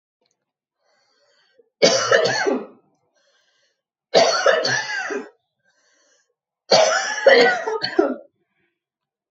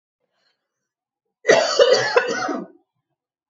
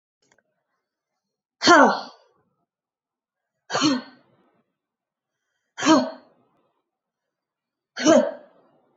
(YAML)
three_cough_length: 9.3 s
three_cough_amplitude: 28322
three_cough_signal_mean_std_ratio: 0.44
cough_length: 3.5 s
cough_amplitude: 32275
cough_signal_mean_std_ratio: 0.41
exhalation_length: 9.0 s
exhalation_amplitude: 27382
exhalation_signal_mean_std_ratio: 0.28
survey_phase: beta (2021-08-13 to 2022-03-07)
age: 18-44
gender: Female
wearing_mask: 'No'
symptom_runny_or_blocked_nose: true
symptom_fatigue: true
symptom_onset: 2 days
smoker_status: Never smoked
respiratory_condition_asthma: false
respiratory_condition_other: false
recruitment_source: Test and Trace
submission_delay: 1 day
covid_test_result: Negative
covid_test_method: RT-qPCR